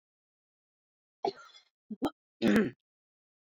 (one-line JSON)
{"cough_length": "3.4 s", "cough_amplitude": 5665, "cough_signal_mean_std_ratio": 0.29, "survey_phase": "beta (2021-08-13 to 2022-03-07)", "age": "65+", "gender": "Female", "wearing_mask": "No", "symptom_none": true, "smoker_status": "Ex-smoker", "respiratory_condition_asthma": false, "respiratory_condition_other": false, "recruitment_source": "REACT", "submission_delay": "1 day", "covid_test_result": "Negative", "covid_test_method": "RT-qPCR"}